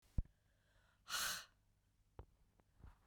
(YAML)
exhalation_length: 3.1 s
exhalation_amplitude: 1942
exhalation_signal_mean_std_ratio: 0.3
survey_phase: beta (2021-08-13 to 2022-03-07)
age: 18-44
gender: Female
wearing_mask: 'No'
symptom_cough_any: true
symptom_runny_or_blocked_nose: true
symptom_shortness_of_breath: true
symptom_fatigue: true
symptom_headache: true
symptom_onset: 2 days
smoker_status: Never smoked
respiratory_condition_asthma: false
respiratory_condition_other: false
recruitment_source: Test and Trace
submission_delay: 2 days
covid_test_result: Positive
covid_test_method: RT-qPCR
covid_ct_value: 22.4
covid_ct_gene: ORF1ab gene
covid_ct_mean: 23.0
covid_viral_load: 28000 copies/ml
covid_viral_load_category: Low viral load (10K-1M copies/ml)